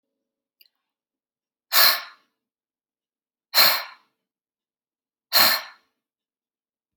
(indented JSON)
{
  "exhalation_length": "7.0 s",
  "exhalation_amplitude": 27135,
  "exhalation_signal_mean_std_ratio": 0.26,
  "survey_phase": "beta (2021-08-13 to 2022-03-07)",
  "age": "45-64",
  "gender": "Female",
  "wearing_mask": "No",
  "symptom_none": true,
  "symptom_onset": "6 days",
  "smoker_status": "Ex-smoker",
  "respiratory_condition_asthma": false,
  "respiratory_condition_other": false,
  "recruitment_source": "REACT",
  "submission_delay": "2 days",
  "covid_test_result": "Negative",
  "covid_test_method": "RT-qPCR",
  "influenza_a_test_result": "Negative",
  "influenza_b_test_result": "Negative"
}